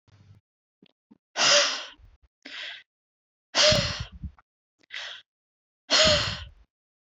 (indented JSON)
{
  "exhalation_length": "7.1 s",
  "exhalation_amplitude": 16316,
  "exhalation_signal_mean_std_ratio": 0.37,
  "survey_phase": "beta (2021-08-13 to 2022-03-07)",
  "age": "18-44",
  "gender": "Female",
  "wearing_mask": "No",
  "symptom_cough_any": true,
  "symptom_runny_or_blocked_nose": true,
  "symptom_sore_throat": true,
  "symptom_headache": true,
  "symptom_other": true,
  "symptom_onset": "7 days",
  "smoker_status": "Ex-smoker",
  "respiratory_condition_asthma": false,
  "respiratory_condition_other": false,
  "recruitment_source": "REACT",
  "submission_delay": "1 day",
  "covid_test_result": "Negative",
  "covid_test_method": "RT-qPCR",
  "influenza_a_test_result": "Unknown/Void",
  "influenza_b_test_result": "Unknown/Void"
}